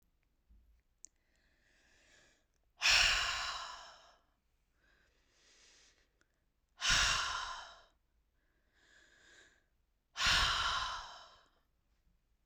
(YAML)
exhalation_length: 12.5 s
exhalation_amplitude: 5128
exhalation_signal_mean_std_ratio: 0.36
survey_phase: beta (2021-08-13 to 2022-03-07)
age: 18-44
gender: Female
wearing_mask: 'No'
symptom_cough_any: true
symptom_new_continuous_cough: true
symptom_runny_or_blocked_nose: true
symptom_sore_throat: true
symptom_abdominal_pain: true
symptom_fatigue: true
symptom_onset: 5 days
smoker_status: Ex-smoker
respiratory_condition_asthma: false
respiratory_condition_other: false
recruitment_source: Test and Trace
submission_delay: 2 days
covid_test_result: Positive
covid_test_method: RT-qPCR
covid_ct_value: 28.6
covid_ct_gene: ORF1ab gene
covid_ct_mean: 29.1
covid_viral_load: 290 copies/ml
covid_viral_load_category: Minimal viral load (< 10K copies/ml)